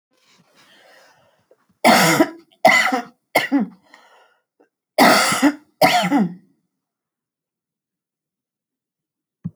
cough_length: 9.6 s
cough_amplitude: 29496
cough_signal_mean_std_ratio: 0.38
survey_phase: alpha (2021-03-01 to 2021-08-12)
age: 65+
gender: Female
wearing_mask: 'No'
symptom_none: true
smoker_status: Ex-smoker
respiratory_condition_asthma: false
respiratory_condition_other: false
recruitment_source: REACT
submission_delay: 1 day
covid_test_result: Negative
covid_test_method: RT-qPCR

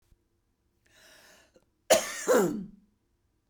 cough_length: 3.5 s
cough_amplitude: 14402
cough_signal_mean_std_ratio: 0.32
survey_phase: beta (2021-08-13 to 2022-03-07)
age: 45-64
gender: Female
wearing_mask: 'No'
symptom_cough_any: true
symptom_runny_or_blocked_nose: true
symptom_shortness_of_breath: true
symptom_sore_throat: true
symptom_fatigue: true
symptom_other: true
smoker_status: Never smoked
respiratory_condition_asthma: true
respiratory_condition_other: false
recruitment_source: Test and Trace
submission_delay: 1 day
covid_test_result: Positive
covid_test_method: ePCR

